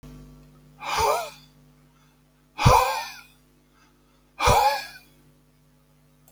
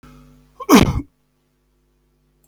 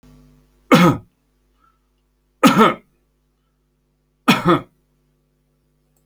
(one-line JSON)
{"exhalation_length": "6.3 s", "exhalation_amplitude": 23057, "exhalation_signal_mean_std_ratio": 0.37, "cough_length": "2.5 s", "cough_amplitude": 32767, "cough_signal_mean_std_ratio": 0.27, "three_cough_length": "6.1 s", "three_cough_amplitude": 30285, "three_cough_signal_mean_std_ratio": 0.29, "survey_phase": "alpha (2021-03-01 to 2021-08-12)", "age": "45-64", "gender": "Male", "wearing_mask": "No", "symptom_none": true, "smoker_status": "Never smoked", "respiratory_condition_asthma": false, "respiratory_condition_other": false, "recruitment_source": "REACT", "submission_delay": "1 day", "covid_test_result": "Negative", "covid_test_method": "RT-qPCR"}